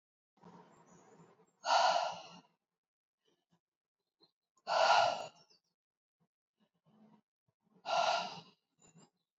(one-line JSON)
{"exhalation_length": "9.4 s", "exhalation_amplitude": 4915, "exhalation_signal_mean_std_ratio": 0.32, "survey_phase": "beta (2021-08-13 to 2022-03-07)", "age": "45-64", "gender": "Female", "wearing_mask": "No", "symptom_cough_any": true, "symptom_runny_or_blocked_nose": true, "symptom_fatigue": true, "symptom_onset": "3 days", "smoker_status": "Never smoked", "respiratory_condition_asthma": false, "respiratory_condition_other": false, "recruitment_source": "Test and Trace", "submission_delay": "2 days", "covid_test_result": "Positive", "covid_test_method": "RT-qPCR", "covid_ct_value": 24.3, "covid_ct_gene": "ORF1ab gene"}